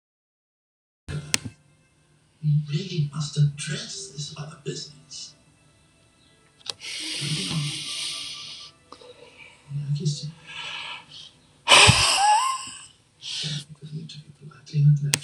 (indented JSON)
{
  "exhalation_length": "15.2 s",
  "exhalation_amplitude": 26028,
  "exhalation_signal_mean_std_ratio": 0.46,
  "survey_phase": "alpha (2021-03-01 to 2021-08-12)",
  "age": "65+",
  "gender": "Male",
  "wearing_mask": "No",
  "symptom_none": true,
  "smoker_status": "Ex-smoker",
  "respiratory_condition_asthma": false,
  "respiratory_condition_other": false,
  "recruitment_source": "REACT",
  "submission_delay": "3 days",
  "covid_test_result": "Negative",
  "covid_test_method": "RT-qPCR"
}